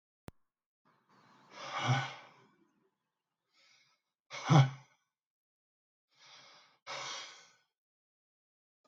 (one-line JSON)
{"exhalation_length": "8.9 s", "exhalation_amplitude": 8711, "exhalation_signal_mean_std_ratio": 0.23, "survey_phase": "beta (2021-08-13 to 2022-03-07)", "age": "45-64", "gender": "Male", "wearing_mask": "No", "symptom_none": true, "smoker_status": "Ex-smoker", "respiratory_condition_asthma": false, "respiratory_condition_other": false, "recruitment_source": "REACT", "submission_delay": "0 days", "covid_test_result": "Negative", "covid_test_method": "RT-qPCR", "influenza_a_test_result": "Negative", "influenza_b_test_result": "Negative"}